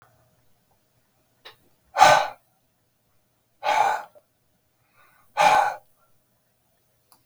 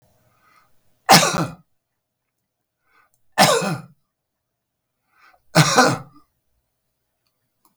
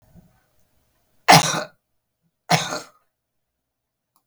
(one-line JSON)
{"exhalation_length": "7.3 s", "exhalation_amplitude": 31366, "exhalation_signal_mean_std_ratio": 0.29, "three_cough_length": "7.8 s", "three_cough_amplitude": 32768, "three_cough_signal_mean_std_ratio": 0.28, "cough_length": "4.3 s", "cough_amplitude": 32768, "cough_signal_mean_std_ratio": 0.24, "survey_phase": "beta (2021-08-13 to 2022-03-07)", "age": "65+", "gender": "Male", "wearing_mask": "No", "symptom_none": true, "smoker_status": "Ex-smoker", "respiratory_condition_asthma": false, "respiratory_condition_other": false, "recruitment_source": "REACT", "submission_delay": "3 days", "covid_test_result": "Negative", "covid_test_method": "RT-qPCR", "influenza_a_test_result": "Negative", "influenza_b_test_result": "Negative"}